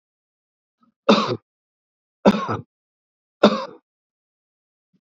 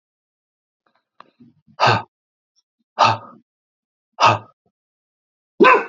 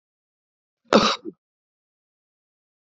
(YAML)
three_cough_length: 5.0 s
three_cough_amplitude: 32768
three_cough_signal_mean_std_ratio: 0.26
exhalation_length: 5.9 s
exhalation_amplitude: 28980
exhalation_signal_mean_std_ratio: 0.28
cough_length: 2.8 s
cough_amplitude: 28656
cough_signal_mean_std_ratio: 0.21
survey_phase: beta (2021-08-13 to 2022-03-07)
age: 45-64
gender: Male
wearing_mask: 'No'
symptom_none: true
symptom_onset: 8 days
smoker_status: Never smoked
respiratory_condition_asthma: false
respiratory_condition_other: false
recruitment_source: REACT
submission_delay: 3 days
covid_test_result: Negative
covid_test_method: RT-qPCR
influenza_a_test_result: Negative
influenza_b_test_result: Negative